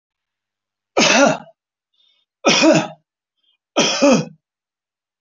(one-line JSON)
{"three_cough_length": "5.2 s", "three_cough_amplitude": 29835, "three_cough_signal_mean_std_ratio": 0.41, "survey_phase": "alpha (2021-03-01 to 2021-08-12)", "age": "65+", "gender": "Male", "wearing_mask": "No", "symptom_none": true, "smoker_status": "Never smoked", "respiratory_condition_asthma": false, "respiratory_condition_other": false, "recruitment_source": "REACT", "submission_delay": "1 day", "covid_test_result": "Negative", "covid_test_method": "RT-qPCR"}